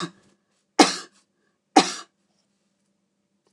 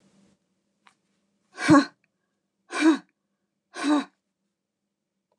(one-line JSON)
{"three_cough_length": "3.5 s", "three_cough_amplitude": 29203, "three_cough_signal_mean_std_ratio": 0.2, "exhalation_length": "5.4 s", "exhalation_amplitude": 22059, "exhalation_signal_mean_std_ratio": 0.27, "survey_phase": "beta (2021-08-13 to 2022-03-07)", "age": "65+", "gender": "Female", "wearing_mask": "No", "symptom_none": true, "smoker_status": "Never smoked", "respiratory_condition_asthma": false, "respiratory_condition_other": false, "recruitment_source": "REACT", "submission_delay": "17 days", "covid_test_result": "Negative", "covid_test_method": "RT-qPCR", "influenza_a_test_result": "Negative", "influenza_b_test_result": "Negative"}